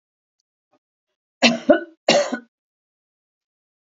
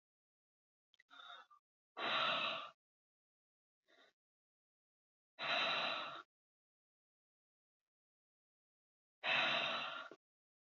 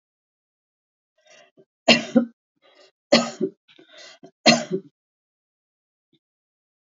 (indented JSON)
{
  "cough_length": "3.8 s",
  "cough_amplitude": 32205,
  "cough_signal_mean_std_ratio": 0.27,
  "exhalation_length": "10.8 s",
  "exhalation_amplitude": 2197,
  "exhalation_signal_mean_std_ratio": 0.37,
  "three_cough_length": "7.0 s",
  "three_cough_amplitude": 31934,
  "three_cough_signal_mean_std_ratio": 0.23,
  "survey_phase": "alpha (2021-03-01 to 2021-08-12)",
  "age": "65+",
  "gender": "Female",
  "wearing_mask": "No",
  "symptom_none": true,
  "smoker_status": "Never smoked",
  "respiratory_condition_asthma": false,
  "respiratory_condition_other": false,
  "recruitment_source": "REACT",
  "submission_delay": "1 day",
  "covid_test_result": "Negative",
  "covid_test_method": "RT-qPCR"
}